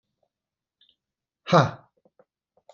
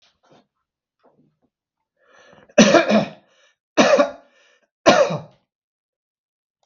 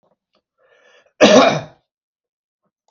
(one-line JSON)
{"exhalation_length": "2.7 s", "exhalation_amplitude": 20839, "exhalation_signal_mean_std_ratio": 0.2, "three_cough_length": "6.7 s", "three_cough_amplitude": 32768, "three_cough_signal_mean_std_ratio": 0.31, "cough_length": "2.9 s", "cough_amplitude": 32768, "cough_signal_mean_std_ratio": 0.29, "survey_phase": "beta (2021-08-13 to 2022-03-07)", "age": "45-64", "gender": "Male", "wearing_mask": "No", "symptom_none": true, "smoker_status": "Ex-smoker", "respiratory_condition_asthma": false, "respiratory_condition_other": false, "recruitment_source": "REACT", "submission_delay": "2 days", "covid_test_result": "Negative", "covid_test_method": "RT-qPCR", "influenza_a_test_result": "Negative", "influenza_b_test_result": "Negative"}